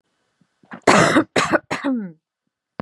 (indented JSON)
{
  "cough_length": "2.8 s",
  "cough_amplitude": 32767,
  "cough_signal_mean_std_ratio": 0.44,
  "survey_phase": "beta (2021-08-13 to 2022-03-07)",
  "age": "18-44",
  "gender": "Female",
  "wearing_mask": "No",
  "symptom_none": true,
  "smoker_status": "Never smoked",
  "respiratory_condition_asthma": true,
  "respiratory_condition_other": false,
  "recruitment_source": "REACT",
  "submission_delay": "1 day",
  "covid_test_result": "Negative",
  "covid_test_method": "RT-qPCR",
  "influenza_a_test_result": "Negative",
  "influenza_b_test_result": "Negative"
}